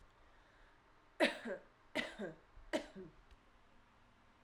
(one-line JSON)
{"three_cough_length": "4.4 s", "three_cough_amplitude": 3354, "three_cough_signal_mean_std_ratio": 0.35, "survey_phase": "alpha (2021-03-01 to 2021-08-12)", "age": "18-44", "gender": "Female", "wearing_mask": "No", "symptom_diarrhoea": true, "symptom_fever_high_temperature": true, "symptom_change_to_sense_of_smell_or_taste": true, "symptom_loss_of_taste": true, "symptom_onset": "2 days", "smoker_status": "Current smoker (1 to 10 cigarettes per day)", "respiratory_condition_asthma": false, "respiratory_condition_other": false, "recruitment_source": "Test and Trace", "submission_delay": "1 day", "covid_test_result": "Positive", "covid_test_method": "RT-qPCR"}